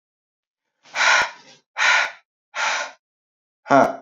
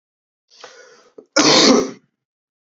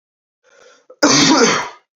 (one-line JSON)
{"exhalation_length": "4.0 s", "exhalation_amplitude": 28247, "exhalation_signal_mean_std_ratio": 0.42, "three_cough_length": "2.7 s", "three_cough_amplitude": 32085, "three_cough_signal_mean_std_ratio": 0.37, "cough_length": "2.0 s", "cough_amplitude": 29457, "cough_signal_mean_std_ratio": 0.49, "survey_phase": "beta (2021-08-13 to 2022-03-07)", "age": "18-44", "gender": "Male", "wearing_mask": "No", "symptom_new_continuous_cough": true, "symptom_runny_or_blocked_nose": true, "symptom_headache": true, "symptom_change_to_sense_of_smell_or_taste": true, "smoker_status": "Prefer not to say", "respiratory_condition_asthma": false, "respiratory_condition_other": false, "recruitment_source": "Test and Trace", "submission_delay": "1 day", "covid_test_result": "Positive", "covid_test_method": "LFT"}